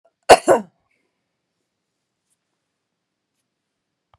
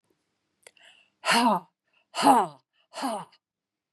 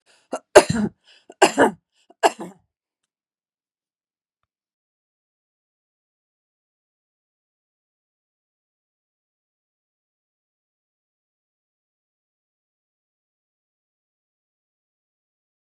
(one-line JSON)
{"cough_length": "4.2 s", "cough_amplitude": 32768, "cough_signal_mean_std_ratio": 0.16, "exhalation_length": "3.9 s", "exhalation_amplitude": 17556, "exhalation_signal_mean_std_ratio": 0.36, "three_cough_length": "15.6 s", "three_cough_amplitude": 32768, "three_cough_signal_mean_std_ratio": 0.13, "survey_phase": "beta (2021-08-13 to 2022-03-07)", "age": "65+", "gender": "Female", "wearing_mask": "No", "symptom_fatigue": true, "symptom_headache": true, "symptom_other": true, "symptom_onset": "8 days", "smoker_status": "Ex-smoker", "respiratory_condition_asthma": false, "respiratory_condition_other": false, "recruitment_source": "REACT", "submission_delay": "1 day", "covid_test_result": "Negative", "covid_test_method": "RT-qPCR", "influenza_a_test_result": "Negative", "influenza_b_test_result": "Negative"}